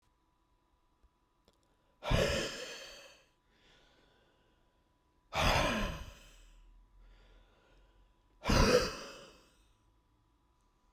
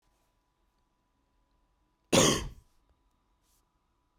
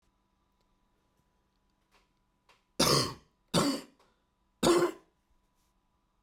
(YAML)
exhalation_length: 10.9 s
exhalation_amplitude: 6422
exhalation_signal_mean_std_ratio: 0.34
cough_length: 4.2 s
cough_amplitude: 10276
cough_signal_mean_std_ratio: 0.22
three_cough_length: 6.2 s
three_cough_amplitude: 8212
three_cough_signal_mean_std_ratio: 0.3
survey_phase: beta (2021-08-13 to 2022-03-07)
age: 18-44
gender: Male
wearing_mask: 'No'
symptom_cough_any: true
symptom_runny_or_blocked_nose: true
symptom_headache: true
symptom_onset: 4 days
smoker_status: Ex-smoker
respiratory_condition_asthma: false
respiratory_condition_other: false
recruitment_source: Test and Trace
submission_delay: 0 days
covid_test_result: Positive
covid_test_method: RT-qPCR
covid_ct_value: 22.5
covid_ct_gene: S gene
covid_ct_mean: 22.8
covid_viral_load: 33000 copies/ml
covid_viral_load_category: Low viral load (10K-1M copies/ml)